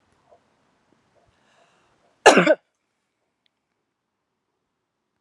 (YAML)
cough_length: 5.2 s
cough_amplitude: 32768
cough_signal_mean_std_ratio: 0.17
survey_phase: beta (2021-08-13 to 2022-03-07)
age: 45-64
gender: Female
wearing_mask: 'No'
symptom_runny_or_blocked_nose: true
symptom_shortness_of_breath: true
symptom_sore_throat: true
symptom_fatigue: true
symptom_change_to_sense_of_smell_or_taste: true
smoker_status: Never smoked
respiratory_condition_asthma: false
respiratory_condition_other: false
recruitment_source: Test and Trace
submission_delay: 2 days
covid_test_result: Positive
covid_test_method: RT-qPCR
covid_ct_value: 19.9
covid_ct_gene: S gene
covid_ct_mean: 20.9
covid_viral_load: 140000 copies/ml
covid_viral_load_category: Low viral load (10K-1M copies/ml)